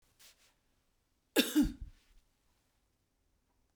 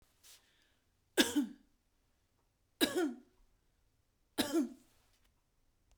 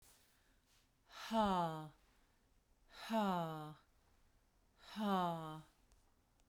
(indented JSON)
{
  "cough_length": "3.8 s",
  "cough_amplitude": 7803,
  "cough_signal_mean_std_ratio": 0.24,
  "three_cough_length": "6.0 s",
  "three_cough_amplitude": 7181,
  "three_cough_signal_mean_std_ratio": 0.3,
  "exhalation_length": "6.5 s",
  "exhalation_amplitude": 1836,
  "exhalation_signal_mean_std_ratio": 0.45,
  "survey_phase": "beta (2021-08-13 to 2022-03-07)",
  "age": "45-64",
  "gender": "Female",
  "wearing_mask": "No",
  "symptom_none": true,
  "smoker_status": "Ex-smoker",
  "respiratory_condition_asthma": false,
  "respiratory_condition_other": false,
  "recruitment_source": "Test and Trace",
  "submission_delay": "2 days",
  "covid_test_result": "Negative",
  "covid_test_method": "RT-qPCR"
}